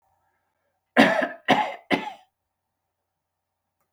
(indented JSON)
{
  "cough_length": "3.9 s",
  "cough_amplitude": 29064,
  "cough_signal_mean_std_ratio": 0.3,
  "survey_phase": "beta (2021-08-13 to 2022-03-07)",
  "age": "45-64",
  "gender": "Male",
  "wearing_mask": "No",
  "symptom_shortness_of_breath": true,
  "symptom_fatigue": true,
  "symptom_onset": "12 days",
  "smoker_status": "Ex-smoker",
  "respiratory_condition_asthma": false,
  "respiratory_condition_other": false,
  "recruitment_source": "REACT",
  "submission_delay": "0 days",
  "covid_test_result": "Negative",
  "covid_test_method": "RT-qPCR",
  "influenza_a_test_result": "Negative",
  "influenza_b_test_result": "Negative"
}